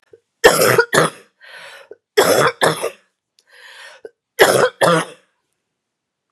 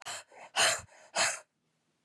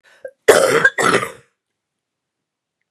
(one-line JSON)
{"three_cough_length": "6.3 s", "three_cough_amplitude": 32768, "three_cough_signal_mean_std_ratio": 0.42, "exhalation_length": "2.0 s", "exhalation_amplitude": 6771, "exhalation_signal_mean_std_ratio": 0.42, "cough_length": "2.9 s", "cough_amplitude": 32768, "cough_signal_mean_std_ratio": 0.38, "survey_phase": "beta (2021-08-13 to 2022-03-07)", "age": "45-64", "gender": "Female", "wearing_mask": "No", "symptom_cough_any": true, "symptom_runny_or_blocked_nose": true, "symptom_headache": true, "symptom_change_to_sense_of_smell_or_taste": true, "symptom_onset": "2 days", "smoker_status": "Ex-smoker", "respiratory_condition_asthma": false, "respiratory_condition_other": false, "recruitment_source": "Test and Trace", "submission_delay": "1 day", "covid_test_result": "Positive", "covid_test_method": "RT-qPCR", "covid_ct_value": 19.2, "covid_ct_gene": "ORF1ab gene", "covid_ct_mean": 19.6, "covid_viral_load": "370000 copies/ml", "covid_viral_load_category": "Low viral load (10K-1M copies/ml)"}